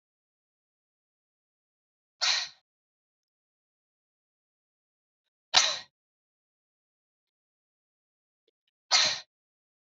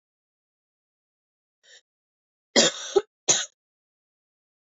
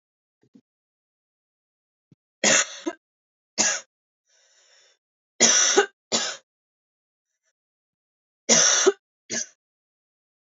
{"exhalation_length": "9.9 s", "exhalation_amplitude": 20645, "exhalation_signal_mean_std_ratio": 0.2, "cough_length": "4.6 s", "cough_amplitude": 19849, "cough_signal_mean_std_ratio": 0.22, "three_cough_length": "10.5 s", "three_cough_amplitude": 27986, "three_cough_signal_mean_std_ratio": 0.31, "survey_phase": "beta (2021-08-13 to 2022-03-07)", "age": "18-44", "gender": "Female", "wearing_mask": "No", "symptom_runny_or_blocked_nose": true, "smoker_status": "Never smoked", "respiratory_condition_asthma": false, "respiratory_condition_other": false, "recruitment_source": "REACT", "submission_delay": "2 days", "covid_test_result": "Negative", "covid_test_method": "RT-qPCR", "influenza_a_test_result": "Negative", "influenza_b_test_result": "Negative"}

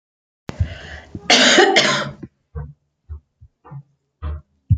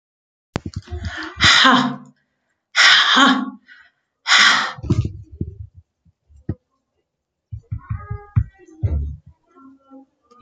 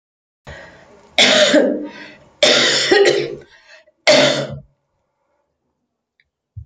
{"cough_length": "4.8 s", "cough_amplitude": 30461, "cough_signal_mean_std_ratio": 0.41, "exhalation_length": "10.4 s", "exhalation_amplitude": 32767, "exhalation_signal_mean_std_ratio": 0.42, "three_cough_length": "6.7 s", "three_cough_amplitude": 32768, "three_cough_signal_mean_std_ratio": 0.47, "survey_phase": "beta (2021-08-13 to 2022-03-07)", "age": "45-64", "gender": "Female", "wearing_mask": "No", "symptom_none": true, "smoker_status": "Never smoked", "respiratory_condition_asthma": false, "respiratory_condition_other": false, "recruitment_source": "REACT", "submission_delay": "2 days", "covid_test_result": "Negative", "covid_test_method": "RT-qPCR", "influenza_a_test_result": "Unknown/Void", "influenza_b_test_result": "Unknown/Void"}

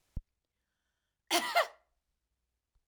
{"cough_length": "2.9 s", "cough_amplitude": 5692, "cough_signal_mean_std_ratio": 0.26, "survey_phase": "alpha (2021-03-01 to 2021-08-12)", "age": "45-64", "gender": "Female", "wearing_mask": "No", "symptom_fatigue": true, "symptom_headache": true, "symptom_onset": "12 days", "smoker_status": "Never smoked", "respiratory_condition_asthma": false, "respiratory_condition_other": false, "recruitment_source": "REACT", "submission_delay": "3 days", "covid_test_result": "Negative", "covid_test_method": "RT-qPCR"}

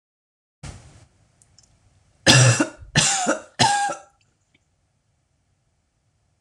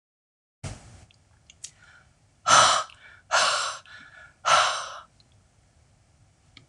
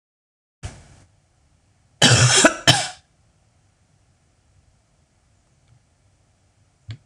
{"three_cough_length": "6.4 s", "three_cough_amplitude": 26028, "three_cough_signal_mean_std_ratio": 0.34, "exhalation_length": "6.7 s", "exhalation_amplitude": 21321, "exhalation_signal_mean_std_ratio": 0.35, "cough_length": "7.1 s", "cough_amplitude": 26028, "cough_signal_mean_std_ratio": 0.26, "survey_phase": "beta (2021-08-13 to 2022-03-07)", "age": "45-64", "gender": "Female", "wearing_mask": "No", "symptom_cough_any": true, "symptom_runny_or_blocked_nose": true, "symptom_fatigue": true, "symptom_fever_high_temperature": true, "symptom_headache": true, "smoker_status": "Never smoked", "respiratory_condition_asthma": false, "respiratory_condition_other": false, "recruitment_source": "Test and Trace", "submission_delay": "1 day", "covid_test_result": "Positive", "covid_test_method": "LFT"}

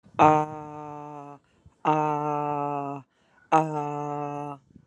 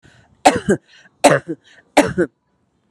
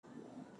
{"exhalation_length": "4.9 s", "exhalation_amplitude": 23639, "exhalation_signal_mean_std_ratio": 0.48, "three_cough_length": "2.9 s", "three_cough_amplitude": 32768, "three_cough_signal_mean_std_ratio": 0.35, "cough_length": "0.6 s", "cough_amplitude": 325, "cough_signal_mean_std_ratio": 1.04, "survey_phase": "alpha (2021-03-01 to 2021-08-12)", "age": "45-64", "gender": "Female", "wearing_mask": "No", "symptom_none": true, "smoker_status": "Never smoked", "respiratory_condition_asthma": false, "respiratory_condition_other": false, "recruitment_source": "REACT", "submission_delay": "1 day", "covid_test_result": "Negative", "covid_test_method": "RT-qPCR"}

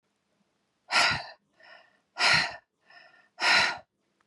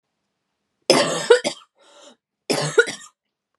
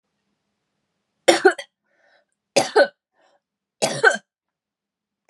{"exhalation_length": "4.3 s", "exhalation_amplitude": 11790, "exhalation_signal_mean_std_ratio": 0.39, "cough_length": "3.6 s", "cough_amplitude": 32312, "cough_signal_mean_std_ratio": 0.34, "three_cough_length": "5.3 s", "three_cough_amplitude": 32767, "three_cough_signal_mean_std_ratio": 0.26, "survey_phase": "beta (2021-08-13 to 2022-03-07)", "age": "18-44", "gender": "Female", "wearing_mask": "No", "symptom_cough_any": true, "symptom_runny_or_blocked_nose": true, "symptom_sore_throat": true, "symptom_fatigue": true, "symptom_headache": true, "symptom_onset": "5 days", "smoker_status": "Never smoked", "respiratory_condition_asthma": false, "respiratory_condition_other": false, "recruitment_source": "Test and Trace", "submission_delay": "2 days", "covid_test_result": "Positive", "covid_test_method": "RT-qPCR", "covid_ct_value": 19.9, "covid_ct_gene": "ORF1ab gene", "covid_ct_mean": 20.2, "covid_viral_load": "240000 copies/ml", "covid_viral_load_category": "Low viral load (10K-1M copies/ml)"}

